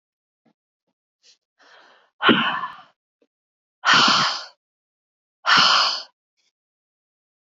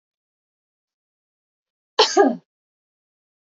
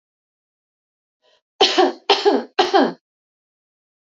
{
  "exhalation_length": "7.4 s",
  "exhalation_amplitude": 25085,
  "exhalation_signal_mean_std_ratio": 0.36,
  "cough_length": "3.4 s",
  "cough_amplitude": 28918,
  "cough_signal_mean_std_ratio": 0.23,
  "three_cough_length": "4.0 s",
  "three_cough_amplitude": 28300,
  "three_cough_signal_mean_std_ratio": 0.36,
  "survey_phase": "beta (2021-08-13 to 2022-03-07)",
  "age": "18-44",
  "gender": "Female",
  "wearing_mask": "No",
  "symptom_none": true,
  "smoker_status": "Never smoked",
  "respiratory_condition_asthma": false,
  "respiratory_condition_other": false,
  "recruitment_source": "REACT",
  "submission_delay": "3 days",
  "covid_test_result": "Negative",
  "covid_test_method": "RT-qPCR",
  "influenza_a_test_result": "Negative",
  "influenza_b_test_result": "Negative"
}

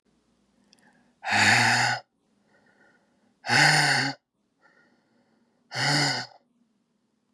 {
  "exhalation_length": "7.3 s",
  "exhalation_amplitude": 15905,
  "exhalation_signal_mean_std_ratio": 0.42,
  "survey_phase": "beta (2021-08-13 to 2022-03-07)",
  "age": "18-44",
  "gender": "Female",
  "wearing_mask": "No",
  "symptom_cough_any": true,
  "symptom_new_continuous_cough": true,
  "symptom_runny_or_blocked_nose": true,
  "symptom_sore_throat": true,
  "symptom_fatigue": true,
  "symptom_headache": true,
  "symptom_onset": "2 days",
  "smoker_status": "Never smoked",
  "respiratory_condition_asthma": false,
  "respiratory_condition_other": false,
  "recruitment_source": "Test and Trace",
  "submission_delay": "1 day",
  "covid_test_result": "Positive",
  "covid_test_method": "RT-qPCR",
  "covid_ct_value": 23.6,
  "covid_ct_gene": "ORF1ab gene",
  "covid_ct_mean": 23.9,
  "covid_viral_load": "14000 copies/ml",
  "covid_viral_load_category": "Low viral load (10K-1M copies/ml)"
}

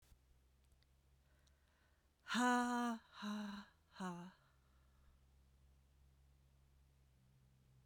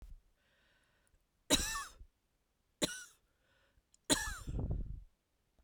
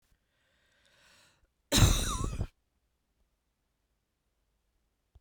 {
  "exhalation_length": "7.9 s",
  "exhalation_amplitude": 1490,
  "exhalation_signal_mean_std_ratio": 0.36,
  "three_cough_length": "5.6 s",
  "three_cough_amplitude": 5784,
  "three_cough_signal_mean_std_ratio": 0.36,
  "cough_length": "5.2 s",
  "cough_amplitude": 10726,
  "cough_signal_mean_std_ratio": 0.26,
  "survey_phase": "beta (2021-08-13 to 2022-03-07)",
  "age": "45-64",
  "gender": "Female",
  "wearing_mask": "No",
  "symptom_sore_throat": true,
  "symptom_headache": true,
  "smoker_status": "Ex-smoker",
  "respiratory_condition_asthma": true,
  "respiratory_condition_other": false,
  "recruitment_source": "REACT",
  "submission_delay": "1 day",
  "covid_test_result": "Negative",
  "covid_test_method": "RT-qPCR"
}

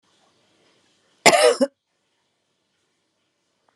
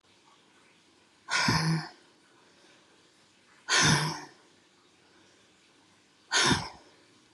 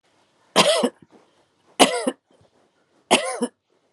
{
  "cough_length": "3.8 s",
  "cough_amplitude": 32768,
  "cough_signal_mean_std_ratio": 0.24,
  "exhalation_length": "7.3 s",
  "exhalation_amplitude": 9456,
  "exhalation_signal_mean_std_ratio": 0.37,
  "three_cough_length": "3.9 s",
  "three_cough_amplitude": 32767,
  "three_cough_signal_mean_std_ratio": 0.35,
  "survey_phase": "alpha (2021-03-01 to 2021-08-12)",
  "age": "45-64",
  "gender": "Female",
  "wearing_mask": "No",
  "symptom_fatigue": true,
  "symptom_headache": true,
  "symptom_change_to_sense_of_smell_or_taste": true,
  "symptom_loss_of_taste": true,
  "smoker_status": "Ex-smoker",
  "respiratory_condition_asthma": false,
  "respiratory_condition_other": true,
  "recruitment_source": "REACT",
  "submission_delay": "1 day",
  "covid_test_result": "Negative",
  "covid_test_method": "RT-qPCR"
}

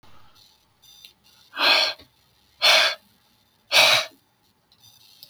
{
  "exhalation_length": "5.3 s",
  "exhalation_amplitude": 29096,
  "exhalation_signal_mean_std_ratio": 0.36,
  "survey_phase": "beta (2021-08-13 to 2022-03-07)",
  "age": "65+",
  "gender": "Male",
  "wearing_mask": "No",
  "symptom_cough_any": true,
  "symptom_runny_or_blocked_nose": true,
  "smoker_status": "Never smoked",
  "respiratory_condition_asthma": false,
  "respiratory_condition_other": false,
  "recruitment_source": "REACT",
  "submission_delay": "5 days",
  "covid_test_result": "Negative",
  "covid_test_method": "RT-qPCR",
  "influenza_a_test_result": "Negative",
  "influenza_b_test_result": "Negative"
}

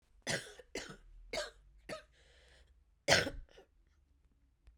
{
  "cough_length": "4.8 s",
  "cough_amplitude": 12572,
  "cough_signal_mean_std_ratio": 0.31,
  "survey_phase": "beta (2021-08-13 to 2022-03-07)",
  "age": "45-64",
  "gender": "Female",
  "wearing_mask": "No",
  "symptom_cough_any": true,
  "symptom_new_continuous_cough": true,
  "symptom_runny_or_blocked_nose": true,
  "symptom_fatigue": true,
  "symptom_fever_high_temperature": true,
  "symptom_headache": true,
  "symptom_onset": "3 days",
  "smoker_status": "Never smoked",
  "respiratory_condition_asthma": false,
  "respiratory_condition_other": false,
  "recruitment_source": "Test and Trace",
  "submission_delay": "2 days",
  "covid_test_result": "Positive",
  "covid_test_method": "ePCR"
}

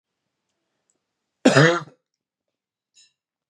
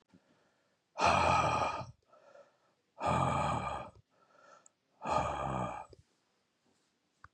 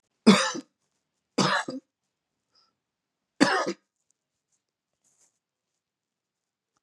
{
  "cough_length": "3.5 s",
  "cough_amplitude": 31250,
  "cough_signal_mean_std_ratio": 0.23,
  "exhalation_length": "7.3 s",
  "exhalation_amplitude": 5499,
  "exhalation_signal_mean_std_ratio": 0.47,
  "three_cough_length": "6.8 s",
  "three_cough_amplitude": 26310,
  "three_cough_signal_mean_std_ratio": 0.25,
  "survey_phase": "beta (2021-08-13 to 2022-03-07)",
  "age": "45-64",
  "gender": "Male",
  "wearing_mask": "No",
  "symptom_cough_any": true,
  "symptom_runny_or_blocked_nose": true,
  "symptom_sore_throat": true,
  "symptom_fatigue": true,
  "symptom_headache": true,
  "smoker_status": "Never smoked",
  "respiratory_condition_asthma": false,
  "respiratory_condition_other": false,
  "recruitment_source": "Test and Trace",
  "submission_delay": "2 days",
  "covid_test_result": "Positive",
  "covid_test_method": "RT-qPCR",
  "covid_ct_value": 18.5,
  "covid_ct_gene": "ORF1ab gene",
  "covid_ct_mean": 18.6,
  "covid_viral_load": "780000 copies/ml",
  "covid_viral_load_category": "Low viral load (10K-1M copies/ml)"
}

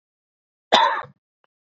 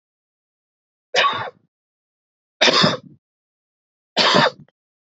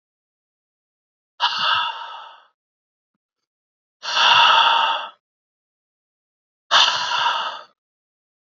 {
  "cough_length": "1.8 s",
  "cough_amplitude": 28136,
  "cough_signal_mean_std_ratio": 0.3,
  "three_cough_length": "5.1 s",
  "three_cough_amplitude": 28215,
  "three_cough_signal_mean_std_ratio": 0.35,
  "exhalation_length": "8.5 s",
  "exhalation_amplitude": 26106,
  "exhalation_signal_mean_std_ratio": 0.41,
  "survey_phase": "beta (2021-08-13 to 2022-03-07)",
  "age": "18-44",
  "gender": "Male",
  "wearing_mask": "No",
  "symptom_new_continuous_cough": true,
  "symptom_shortness_of_breath": true,
  "symptom_onset": "12 days",
  "smoker_status": "Never smoked",
  "respiratory_condition_asthma": false,
  "respiratory_condition_other": false,
  "recruitment_source": "REACT",
  "submission_delay": "0 days",
  "covid_test_result": "Negative",
  "covid_test_method": "RT-qPCR",
  "influenza_a_test_result": "Negative",
  "influenza_b_test_result": "Negative"
}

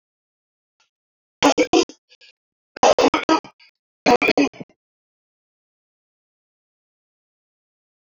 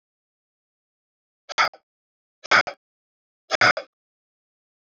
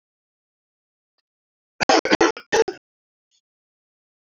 {
  "three_cough_length": "8.1 s",
  "three_cough_amplitude": 26848,
  "three_cough_signal_mean_std_ratio": 0.28,
  "exhalation_length": "4.9 s",
  "exhalation_amplitude": 25244,
  "exhalation_signal_mean_std_ratio": 0.22,
  "cough_length": "4.4 s",
  "cough_amplitude": 24741,
  "cough_signal_mean_std_ratio": 0.25,
  "survey_phase": "beta (2021-08-13 to 2022-03-07)",
  "age": "45-64",
  "gender": "Male",
  "wearing_mask": "No",
  "symptom_cough_any": true,
  "symptom_runny_or_blocked_nose": true,
  "symptom_shortness_of_breath": true,
  "symptom_fatigue": true,
  "symptom_headache": true,
  "symptom_change_to_sense_of_smell_or_taste": true,
  "symptom_loss_of_taste": true,
  "smoker_status": "Ex-smoker",
  "respiratory_condition_asthma": false,
  "respiratory_condition_other": false,
  "recruitment_source": "Test and Trace",
  "submission_delay": "3 days",
  "covid_test_result": "Positive",
  "covid_test_method": "RT-qPCR",
  "covid_ct_value": 19.6,
  "covid_ct_gene": "ORF1ab gene"
}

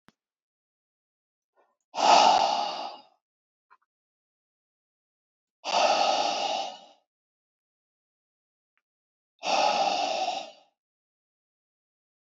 {
  "exhalation_length": "12.3 s",
  "exhalation_amplitude": 16359,
  "exhalation_signal_mean_std_ratio": 0.37,
  "survey_phase": "beta (2021-08-13 to 2022-03-07)",
  "age": "18-44",
  "gender": "Male",
  "wearing_mask": "No",
  "symptom_none": true,
  "symptom_onset": "13 days",
  "smoker_status": "Never smoked",
  "respiratory_condition_asthma": false,
  "respiratory_condition_other": false,
  "recruitment_source": "REACT",
  "submission_delay": "3 days",
  "covid_test_result": "Negative",
  "covid_test_method": "RT-qPCR",
  "influenza_a_test_result": "Negative",
  "influenza_b_test_result": "Negative"
}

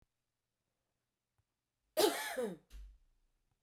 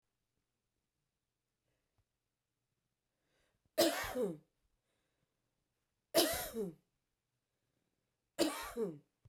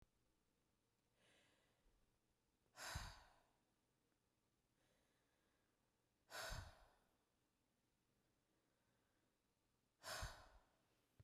{
  "cough_length": "3.6 s",
  "cough_amplitude": 4538,
  "cough_signal_mean_std_ratio": 0.29,
  "three_cough_length": "9.3 s",
  "three_cough_amplitude": 4638,
  "three_cough_signal_mean_std_ratio": 0.29,
  "exhalation_length": "11.2 s",
  "exhalation_amplitude": 486,
  "exhalation_signal_mean_std_ratio": 0.31,
  "survey_phase": "beta (2021-08-13 to 2022-03-07)",
  "age": "45-64",
  "gender": "Female",
  "wearing_mask": "No",
  "symptom_none": true,
  "smoker_status": "Ex-smoker",
  "respiratory_condition_asthma": false,
  "respiratory_condition_other": false,
  "recruitment_source": "REACT",
  "submission_delay": "1 day",
  "covid_test_result": "Negative",
  "covid_test_method": "RT-qPCR",
  "influenza_a_test_result": "Unknown/Void",
  "influenza_b_test_result": "Unknown/Void"
}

